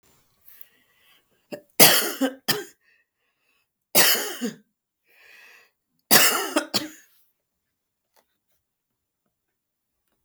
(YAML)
three_cough_length: 10.2 s
three_cough_amplitude: 32768
three_cough_signal_mean_std_ratio: 0.28
survey_phase: beta (2021-08-13 to 2022-03-07)
age: 65+
gender: Female
wearing_mask: 'No'
symptom_runny_or_blocked_nose: true
symptom_onset: 3 days
smoker_status: Never smoked
respiratory_condition_asthma: false
respiratory_condition_other: false
recruitment_source: Test and Trace
submission_delay: 1 day
covid_test_result: Positive
covid_test_method: RT-qPCR
covid_ct_value: 26.8
covid_ct_gene: ORF1ab gene